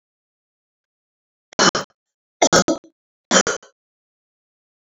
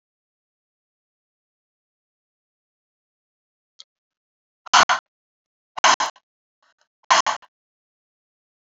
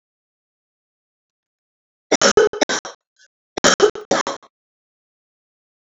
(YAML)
three_cough_length: 4.9 s
three_cough_amplitude: 30761
three_cough_signal_mean_std_ratio: 0.27
exhalation_length: 8.8 s
exhalation_amplitude: 27228
exhalation_signal_mean_std_ratio: 0.19
cough_length: 5.8 s
cough_amplitude: 32525
cough_signal_mean_std_ratio: 0.29
survey_phase: alpha (2021-03-01 to 2021-08-12)
age: 65+
gender: Female
wearing_mask: 'No'
symptom_cough_any: true
symptom_fatigue: true
symptom_headache: true
smoker_status: Never smoked
respiratory_condition_asthma: false
respiratory_condition_other: false
recruitment_source: Test and Trace
submission_delay: 2 days
covid_test_result: Positive
covid_test_method: RT-qPCR
covid_ct_value: 12.8
covid_ct_gene: ORF1ab gene
covid_ct_mean: 13.1
covid_viral_load: 50000000 copies/ml
covid_viral_load_category: High viral load (>1M copies/ml)